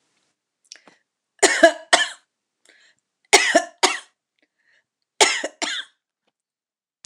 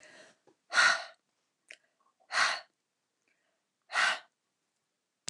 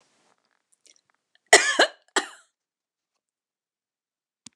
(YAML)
three_cough_length: 7.1 s
three_cough_amplitude: 29204
three_cough_signal_mean_std_ratio: 0.29
exhalation_length: 5.3 s
exhalation_amplitude: 8916
exhalation_signal_mean_std_ratio: 0.3
cough_length: 4.6 s
cough_amplitude: 29204
cough_signal_mean_std_ratio: 0.19
survey_phase: beta (2021-08-13 to 2022-03-07)
age: 65+
gender: Female
wearing_mask: 'No'
symptom_cough_any: true
smoker_status: Never smoked
respiratory_condition_asthma: false
respiratory_condition_other: false
recruitment_source: REACT
submission_delay: 1 day
covid_test_result: Negative
covid_test_method: RT-qPCR
influenza_a_test_result: Negative
influenza_b_test_result: Negative